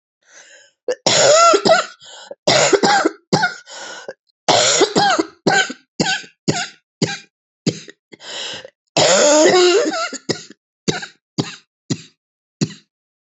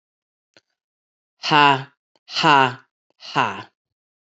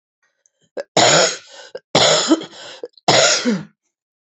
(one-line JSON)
{"cough_length": "13.4 s", "cough_amplitude": 30237, "cough_signal_mean_std_ratio": 0.51, "exhalation_length": "4.3 s", "exhalation_amplitude": 29671, "exhalation_signal_mean_std_ratio": 0.32, "three_cough_length": "4.3 s", "three_cough_amplitude": 32768, "three_cough_signal_mean_std_ratio": 0.49, "survey_phase": "alpha (2021-03-01 to 2021-08-12)", "age": "45-64", "gender": "Female", "wearing_mask": "No", "symptom_cough_any": true, "symptom_new_continuous_cough": true, "symptom_shortness_of_breath": true, "symptom_fatigue": true, "symptom_fever_high_temperature": true, "symptom_headache": true, "symptom_change_to_sense_of_smell_or_taste": true, "symptom_loss_of_taste": true, "symptom_onset": "3 days", "smoker_status": "Prefer not to say", "respiratory_condition_asthma": false, "respiratory_condition_other": false, "recruitment_source": "Test and Trace", "submission_delay": "2 days", "covid_test_result": "Positive", "covid_test_method": "RT-qPCR"}